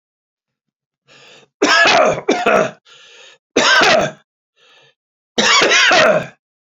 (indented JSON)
{
  "three_cough_length": "6.7 s",
  "three_cough_amplitude": 32486,
  "three_cough_signal_mean_std_ratio": 0.53,
  "survey_phase": "beta (2021-08-13 to 2022-03-07)",
  "age": "65+",
  "gender": "Male",
  "wearing_mask": "No",
  "symptom_none": true,
  "smoker_status": "Never smoked",
  "respiratory_condition_asthma": false,
  "respiratory_condition_other": false,
  "recruitment_source": "REACT",
  "submission_delay": "2 days",
  "covid_test_result": "Negative",
  "covid_test_method": "RT-qPCR"
}